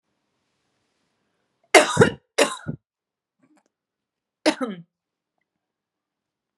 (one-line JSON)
{"cough_length": "6.6 s", "cough_amplitude": 32657, "cough_signal_mean_std_ratio": 0.21, "survey_phase": "beta (2021-08-13 to 2022-03-07)", "age": "18-44", "gender": "Female", "wearing_mask": "No", "symptom_cough_any": true, "symptom_sore_throat": true, "symptom_other": true, "symptom_onset": "6 days", "smoker_status": "Never smoked", "respiratory_condition_asthma": false, "respiratory_condition_other": false, "recruitment_source": "Test and Trace", "submission_delay": "1 day", "covid_test_result": "Positive", "covid_test_method": "RT-qPCR", "covid_ct_value": 19.8, "covid_ct_gene": "ORF1ab gene", "covid_ct_mean": 20.1, "covid_viral_load": "260000 copies/ml", "covid_viral_load_category": "Low viral load (10K-1M copies/ml)"}